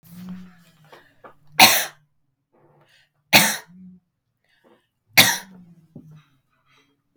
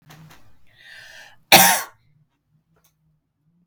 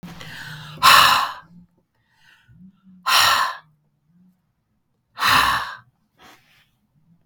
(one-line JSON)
{"three_cough_length": "7.2 s", "three_cough_amplitude": 32768, "three_cough_signal_mean_std_ratio": 0.24, "cough_length": "3.7 s", "cough_amplitude": 32768, "cough_signal_mean_std_ratio": 0.24, "exhalation_length": "7.3 s", "exhalation_amplitude": 32768, "exhalation_signal_mean_std_ratio": 0.37, "survey_phase": "beta (2021-08-13 to 2022-03-07)", "age": "45-64", "gender": "Female", "wearing_mask": "No", "symptom_none": true, "smoker_status": "Never smoked", "respiratory_condition_asthma": false, "respiratory_condition_other": false, "recruitment_source": "Test and Trace", "submission_delay": "0 days", "covid_test_result": "Positive", "covid_test_method": "RT-qPCR", "covid_ct_value": 21.5, "covid_ct_gene": "ORF1ab gene", "covid_ct_mean": 21.8, "covid_viral_load": "72000 copies/ml", "covid_viral_load_category": "Low viral load (10K-1M copies/ml)"}